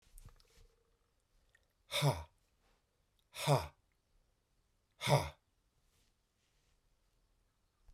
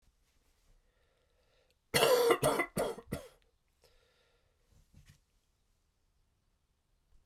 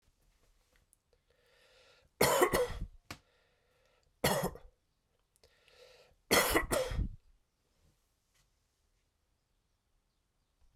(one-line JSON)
{"exhalation_length": "7.9 s", "exhalation_amplitude": 4510, "exhalation_signal_mean_std_ratio": 0.25, "cough_length": "7.3 s", "cough_amplitude": 10147, "cough_signal_mean_std_ratio": 0.29, "three_cough_length": "10.8 s", "three_cough_amplitude": 8369, "three_cough_signal_mean_std_ratio": 0.31, "survey_phase": "beta (2021-08-13 to 2022-03-07)", "age": "45-64", "gender": "Male", "wearing_mask": "No", "symptom_cough_any": true, "symptom_change_to_sense_of_smell_or_taste": true, "symptom_onset": "9 days", "smoker_status": "Never smoked", "respiratory_condition_asthma": false, "respiratory_condition_other": false, "recruitment_source": "Test and Trace", "submission_delay": "2 days", "covid_test_result": "Positive", "covid_test_method": "ePCR"}